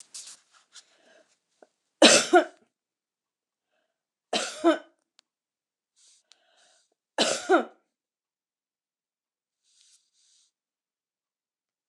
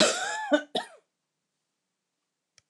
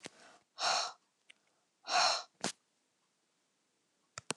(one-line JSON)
{"three_cough_length": "11.9 s", "three_cough_amplitude": 24667, "three_cough_signal_mean_std_ratio": 0.21, "cough_length": "2.7 s", "cough_amplitude": 14962, "cough_signal_mean_std_ratio": 0.35, "exhalation_length": "4.4 s", "exhalation_amplitude": 6318, "exhalation_signal_mean_std_ratio": 0.33, "survey_phase": "beta (2021-08-13 to 2022-03-07)", "age": "65+", "gender": "Female", "wearing_mask": "No", "symptom_none": true, "smoker_status": "Ex-smoker", "respiratory_condition_asthma": false, "respiratory_condition_other": false, "recruitment_source": "REACT", "submission_delay": "5 days", "covid_test_result": "Negative", "covid_test_method": "RT-qPCR"}